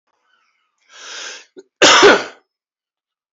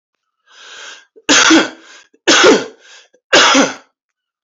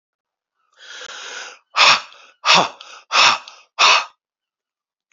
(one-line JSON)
{"cough_length": "3.3 s", "cough_amplitude": 32767, "cough_signal_mean_std_ratio": 0.31, "three_cough_length": "4.4 s", "three_cough_amplitude": 32191, "three_cough_signal_mean_std_ratio": 0.46, "exhalation_length": "5.1 s", "exhalation_amplitude": 31930, "exhalation_signal_mean_std_ratio": 0.38, "survey_phase": "beta (2021-08-13 to 2022-03-07)", "age": "45-64", "gender": "Male", "wearing_mask": "No", "symptom_cough_any": true, "symptom_runny_or_blocked_nose": true, "symptom_fatigue": true, "symptom_headache": true, "symptom_change_to_sense_of_smell_or_taste": true, "smoker_status": "Ex-smoker", "respiratory_condition_asthma": false, "respiratory_condition_other": false, "recruitment_source": "Test and Trace", "submission_delay": "1 day", "covid_test_result": "Positive", "covid_test_method": "LFT"}